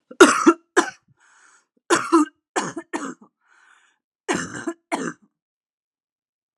three_cough_length: 6.6 s
three_cough_amplitude: 32768
three_cough_signal_mean_std_ratio: 0.3
survey_phase: alpha (2021-03-01 to 2021-08-12)
age: 18-44
gender: Female
wearing_mask: 'No'
symptom_cough_any: true
symptom_fatigue: true
symptom_headache: true
smoker_status: Never smoked
respiratory_condition_asthma: false
respiratory_condition_other: false
recruitment_source: Test and Trace
submission_delay: 2 days
covid_test_result: Positive
covid_test_method: RT-qPCR
covid_ct_value: 18.4
covid_ct_gene: ORF1ab gene
covid_ct_mean: 18.9
covid_viral_load: 650000 copies/ml
covid_viral_load_category: Low viral load (10K-1M copies/ml)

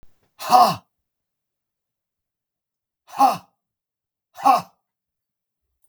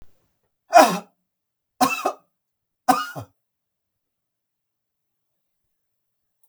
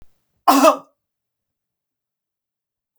exhalation_length: 5.9 s
exhalation_amplitude: 32335
exhalation_signal_mean_std_ratio: 0.26
three_cough_length: 6.5 s
three_cough_amplitude: 32768
three_cough_signal_mean_std_ratio: 0.22
cough_length: 3.0 s
cough_amplitude: 32768
cough_signal_mean_std_ratio: 0.24
survey_phase: beta (2021-08-13 to 2022-03-07)
age: 45-64
gender: Male
wearing_mask: 'No'
symptom_none: true
smoker_status: Never smoked
respiratory_condition_asthma: false
respiratory_condition_other: false
recruitment_source: REACT
submission_delay: 4 days
covid_test_result: Negative
covid_test_method: RT-qPCR
influenza_a_test_result: Negative
influenza_b_test_result: Negative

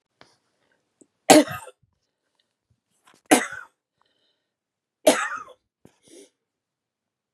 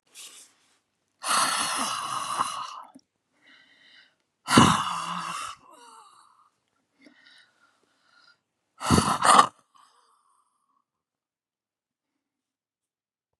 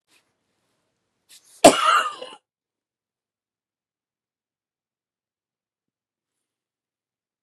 three_cough_length: 7.3 s
three_cough_amplitude: 32767
three_cough_signal_mean_std_ratio: 0.19
exhalation_length: 13.4 s
exhalation_amplitude: 28280
exhalation_signal_mean_std_ratio: 0.31
cough_length: 7.4 s
cough_amplitude: 32768
cough_signal_mean_std_ratio: 0.16
survey_phase: beta (2021-08-13 to 2022-03-07)
age: 65+
gender: Female
wearing_mask: 'No'
symptom_none: true
smoker_status: Ex-smoker
respiratory_condition_asthma: false
respiratory_condition_other: true
recruitment_source: REACT
submission_delay: 1 day
covid_test_result: Negative
covid_test_method: RT-qPCR
influenza_a_test_result: Unknown/Void
influenza_b_test_result: Unknown/Void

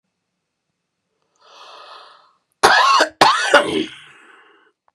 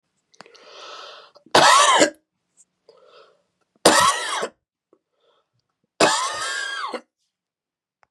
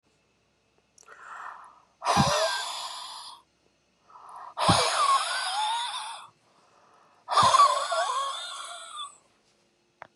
cough_length: 4.9 s
cough_amplitude: 32768
cough_signal_mean_std_ratio: 0.37
three_cough_length: 8.1 s
three_cough_amplitude: 32767
three_cough_signal_mean_std_ratio: 0.37
exhalation_length: 10.2 s
exhalation_amplitude: 12907
exhalation_signal_mean_std_ratio: 0.5
survey_phase: beta (2021-08-13 to 2022-03-07)
age: 65+
gender: Male
wearing_mask: 'No'
symptom_none: true
smoker_status: Ex-smoker
respiratory_condition_asthma: true
respiratory_condition_other: true
recruitment_source: REACT
submission_delay: 2 days
covid_test_result: Negative
covid_test_method: RT-qPCR
influenza_a_test_result: Negative
influenza_b_test_result: Negative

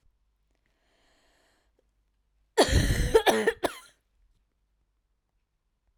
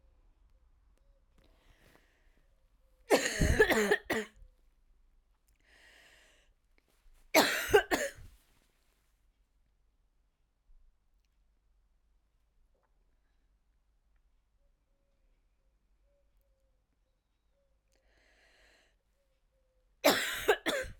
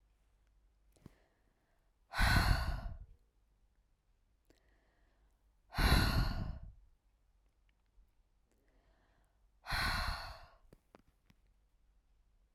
cough_length: 6.0 s
cough_amplitude: 14646
cough_signal_mean_std_ratio: 0.3
three_cough_length: 21.0 s
three_cough_amplitude: 12254
three_cough_signal_mean_std_ratio: 0.25
exhalation_length: 12.5 s
exhalation_amplitude: 4742
exhalation_signal_mean_std_ratio: 0.33
survey_phase: beta (2021-08-13 to 2022-03-07)
age: 18-44
gender: Female
wearing_mask: 'No'
symptom_cough_any: true
symptom_fatigue: true
symptom_fever_high_temperature: true
symptom_change_to_sense_of_smell_or_taste: true
symptom_loss_of_taste: true
symptom_onset: 6 days
smoker_status: Never smoked
respiratory_condition_asthma: false
respiratory_condition_other: false
recruitment_source: Test and Trace
submission_delay: 2 days
covid_test_result: Positive
covid_test_method: RT-qPCR
covid_ct_value: 17.9
covid_ct_gene: ORF1ab gene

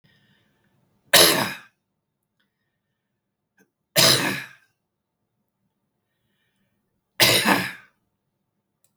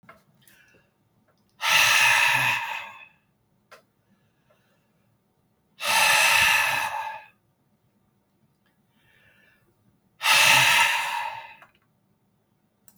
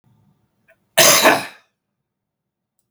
three_cough_length: 9.0 s
three_cough_amplitude: 32768
three_cough_signal_mean_std_ratio: 0.28
exhalation_length: 13.0 s
exhalation_amplitude: 18516
exhalation_signal_mean_std_ratio: 0.43
cough_length: 2.9 s
cough_amplitude: 32768
cough_signal_mean_std_ratio: 0.31
survey_phase: beta (2021-08-13 to 2022-03-07)
age: 65+
gender: Male
wearing_mask: 'No'
symptom_none: true
smoker_status: Never smoked
respiratory_condition_asthma: false
respiratory_condition_other: false
recruitment_source: REACT
submission_delay: 1 day
covid_test_result: Negative
covid_test_method: RT-qPCR
influenza_a_test_result: Negative
influenza_b_test_result: Negative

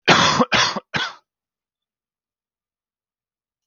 three_cough_length: 3.7 s
three_cough_amplitude: 30170
three_cough_signal_mean_std_ratio: 0.35
survey_phase: beta (2021-08-13 to 2022-03-07)
age: 18-44
gender: Male
wearing_mask: 'No'
symptom_none: true
smoker_status: Never smoked
respiratory_condition_asthma: false
respiratory_condition_other: false
recruitment_source: REACT
submission_delay: 3 days
covid_test_result: Negative
covid_test_method: RT-qPCR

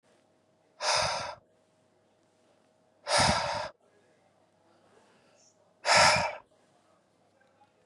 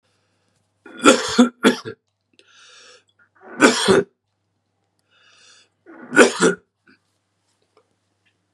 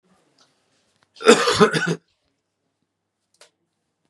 exhalation_length: 7.9 s
exhalation_amplitude: 12033
exhalation_signal_mean_std_ratio: 0.34
three_cough_length: 8.5 s
three_cough_amplitude: 32768
three_cough_signal_mean_std_ratio: 0.29
cough_length: 4.1 s
cough_amplitude: 32768
cough_signal_mean_std_ratio: 0.28
survey_phase: beta (2021-08-13 to 2022-03-07)
age: 45-64
gender: Male
wearing_mask: 'No'
symptom_cough_any: true
symptom_runny_or_blocked_nose: true
symptom_fatigue: true
symptom_onset: 8 days
smoker_status: Never smoked
respiratory_condition_asthma: false
respiratory_condition_other: false
recruitment_source: REACT
submission_delay: 0 days
covid_test_result: Negative
covid_test_method: RT-qPCR
influenza_a_test_result: Negative
influenza_b_test_result: Negative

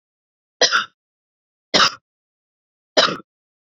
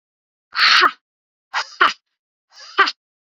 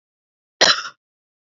three_cough_length: 3.8 s
three_cough_amplitude: 30458
three_cough_signal_mean_std_ratio: 0.29
exhalation_length: 3.3 s
exhalation_amplitude: 30080
exhalation_signal_mean_std_ratio: 0.35
cough_length: 1.5 s
cough_amplitude: 31212
cough_signal_mean_std_ratio: 0.26
survey_phase: beta (2021-08-13 to 2022-03-07)
age: 45-64
gender: Female
wearing_mask: 'No'
symptom_runny_or_blocked_nose: true
smoker_status: Never smoked
respiratory_condition_asthma: false
respiratory_condition_other: false
recruitment_source: REACT
submission_delay: 2 days
covid_test_result: Negative
covid_test_method: RT-qPCR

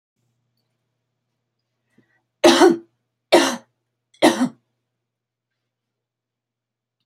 three_cough_length: 7.1 s
three_cough_amplitude: 32375
three_cough_signal_mean_std_ratio: 0.25
survey_phase: beta (2021-08-13 to 2022-03-07)
age: 45-64
gender: Female
wearing_mask: 'No'
symptom_none: true
smoker_status: Never smoked
respiratory_condition_asthma: false
respiratory_condition_other: false
recruitment_source: REACT
submission_delay: 1 day
covid_test_result: Negative
covid_test_method: RT-qPCR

